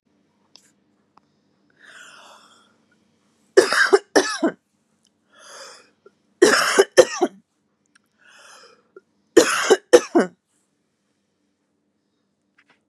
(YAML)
three_cough_length: 12.9 s
three_cough_amplitude: 32768
three_cough_signal_mean_std_ratio: 0.27
survey_phase: beta (2021-08-13 to 2022-03-07)
age: 18-44
gender: Female
wearing_mask: 'No'
symptom_none: true
smoker_status: Ex-smoker
respiratory_condition_asthma: false
respiratory_condition_other: false
recruitment_source: Test and Trace
submission_delay: 2 days
covid_test_result: Positive
covid_test_method: RT-qPCR
covid_ct_value: 35.6
covid_ct_gene: N gene